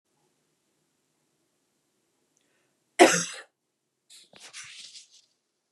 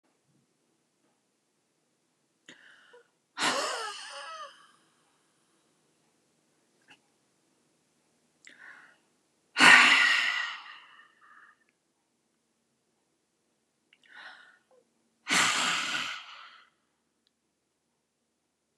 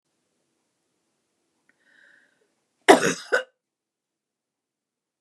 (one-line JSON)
{"three_cough_length": "5.7 s", "three_cough_amplitude": 27176, "three_cough_signal_mean_std_ratio": 0.16, "exhalation_length": "18.8 s", "exhalation_amplitude": 24159, "exhalation_signal_mean_std_ratio": 0.25, "cough_length": "5.2 s", "cough_amplitude": 29204, "cough_signal_mean_std_ratio": 0.17, "survey_phase": "beta (2021-08-13 to 2022-03-07)", "age": "45-64", "gender": "Female", "wearing_mask": "No", "symptom_none": true, "smoker_status": "Ex-smoker", "respiratory_condition_asthma": false, "respiratory_condition_other": false, "recruitment_source": "REACT", "submission_delay": "1 day", "covid_test_result": "Negative", "covid_test_method": "RT-qPCR"}